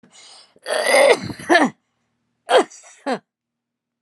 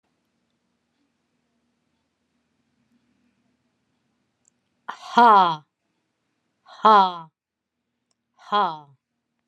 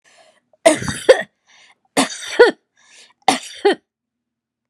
{"cough_length": "4.0 s", "cough_amplitude": 31741, "cough_signal_mean_std_ratio": 0.4, "exhalation_length": "9.5 s", "exhalation_amplitude": 22696, "exhalation_signal_mean_std_ratio": 0.24, "three_cough_length": "4.7 s", "three_cough_amplitude": 32768, "three_cough_signal_mean_std_ratio": 0.32, "survey_phase": "alpha (2021-03-01 to 2021-08-12)", "age": "45-64", "gender": "Female", "wearing_mask": "No", "symptom_none": true, "smoker_status": "Never smoked", "respiratory_condition_asthma": false, "respiratory_condition_other": false, "recruitment_source": "REACT", "submission_delay": "1 day", "covid_test_result": "Negative", "covid_test_method": "RT-qPCR"}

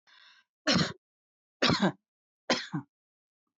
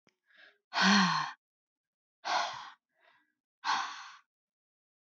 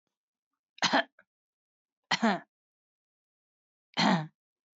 {"three_cough_length": "3.6 s", "three_cough_amplitude": 8884, "three_cough_signal_mean_std_ratio": 0.35, "exhalation_length": "5.1 s", "exhalation_amplitude": 8083, "exhalation_signal_mean_std_ratio": 0.37, "cough_length": "4.8 s", "cough_amplitude": 8976, "cough_signal_mean_std_ratio": 0.29, "survey_phase": "beta (2021-08-13 to 2022-03-07)", "age": "45-64", "gender": "Female", "wearing_mask": "No", "symptom_runny_or_blocked_nose": true, "symptom_headache": true, "smoker_status": "Never smoked", "respiratory_condition_asthma": false, "respiratory_condition_other": false, "recruitment_source": "REACT", "submission_delay": "2 days", "covid_test_result": "Negative", "covid_test_method": "RT-qPCR"}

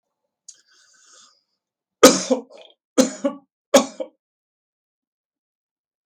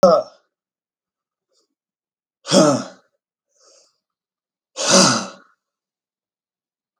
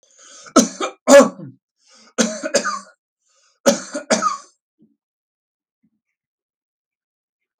{"cough_length": "6.1 s", "cough_amplitude": 32768, "cough_signal_mean_std_ratio": 0.22, "exhalation_length": "7.0 s", "exhalation_amplitude": 32768, "exhalation_signal_mean_std_ratio": 0.29, "three_cough_length": "7.6 s", "three_cough_amplitude": 32766, "three_cough_signal_mean_std_ratio": 0.28, "survey_phase": "beta (2021-08-13 to 2022-03-07)", "age": "65+", "gender": "Male", "wearing_mask": "No", "symptom_none": true, "smoker_status": "Never smoked", "respiratory_condition_asthma": true, "respiratory_condition_other": false, "recruitment_source": "REACT", "submission_delay": "3 days", "covid_test_result": "Negative", "covid_test_method": "RT-qPCR"}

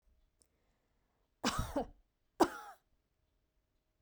{"cough_length": "4.0 s", "cough_amplitude": 5448, "cough_signal_mean_std_ratio": 0.25, "survey_phase": "beta (2021-08-13 to 2022-03-07)", "age": "45-64", "gender": "Female", "wearing_mask": "No", "symptom_none": true, "smoker_status": "Never smoked", "respiratory_condition_asthma": false, "respiratory_condition_other": false, "recruitment_source": "REACT", "submission_delay": "4 days", "covid_test_result": "Negative", "covid_test_method": "RT-qPCR"}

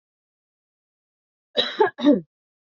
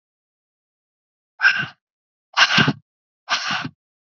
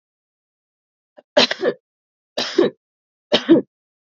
{"cough_length": "2.7 s", "cough_amplitude": 20418, "cough_signal_mean_std_ratio": 0.3, "exhalation_length": "4.0 s", "exhalation_amplitude": 28768, "exhalation_signal_mean_std_ratio": 0.35, "three_cough_length": "4.2 s", "three_cough_amplitude": 29919, "three_cough_signal_mean_std_ratio": 0.3, "survey_phase": "beta (2021-08-13 to 2022-03-07)", "age": "18-44", "gender": "Female", "wearing_mask": "No", "symptom_runny_or_blocked_nose": true, "symptom_fatigue": true, "symptom_headache": true, "symptom_onset": "2 days", "smoker_status": "Never smoked", "respiratory_condition_asthma": false, "respiratory_condition_other": false, "recruitment_source": "Test and Trace", "submission_delay": "1 day", "covid_test_result": "Positive", "covid_test_method": "RT-qPCR", "covid_ct_value": 19.9, "covid_ct_gene": "N gene", "covid_ct_mean": 20.4, "covid_viral_load": "200000 copies/ml", "covid_viral_load_category": "Low viral load (10K-1M copies/ml)"}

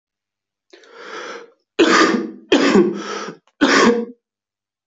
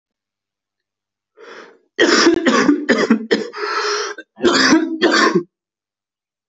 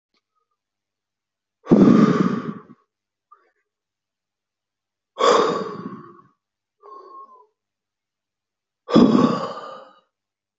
{"three_cough_length": "4.9 s", "three_cough_amplitude": 30199, "three_cough_signal_mean_std_ratio": 0.48, "cough_length": "6.5 s", "cough_amplitude": 26337, "cough_signal_mean_std_ratio": 0.55, "exhalation_length": "10.6 s", "exhalation_amplitude": 26070, "exhalation_signal_mean_std_ratio": 0.33, "survey_phase": "alpha (2021-03-01 to 2021-08-12)", "age": "18-44", "gender": "Male", "wearing_mask": "No", "symptom_cough_any": true, "symptom_shortness_of_breath": true, "symptom_headache": true, "symptom_change_to_sense_of_smell_or_taste": true, "symptom_onset": "4 days", "smoker_status": "Never smoked", "respiratory_condition_asthma": false, "respiratory_condition_other": false, "recruitment_source": "Test and Trace", "submission_delay": "2 days", "covid_test_result": "Positive", "covid_test_method": "RT-qPCR", "covid_ct_value": 13.7, "covid_ct_gene": "ORF1ab gene", "covid_ct_mean": 14.2, "covid_viral_load": "22000000 copies/ml", "covid_viral_load_category": "High viral load (>1M copies/ml)"}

